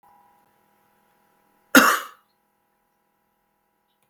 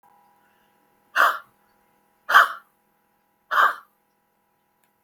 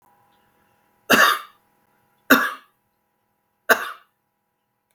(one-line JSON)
{"cough_length": "4.1 s", "cough_amplitude": 32768, "cough_signal_mean_std_ratio": 0.19, "exhalation_length": "5.0 s", "exhalation_amplitude": 32766, "exhalation_signal_mean_std_ratio": 0.26, "three_cough_length": "4.9 s", "three_cough_amplitude": 32768, "three_cough_signal_mean_std_ratio": 0.27, "survey_phase": "beta (2021-08-13 to 2022-03-07)", "age": "65+", "gender": "Female", "wearing_mask": "No", "symptom_none": true, "smoker_status": "Current smoker (11 or more cigarettes per day)", "respiratory_condition_asthma": false, "respiratory_condition_other": false, "recruitment_source": "Test and Trace", "submission_delay": "4 days", "covid_test_result": "Negative", "covid_test_method": "LFT"}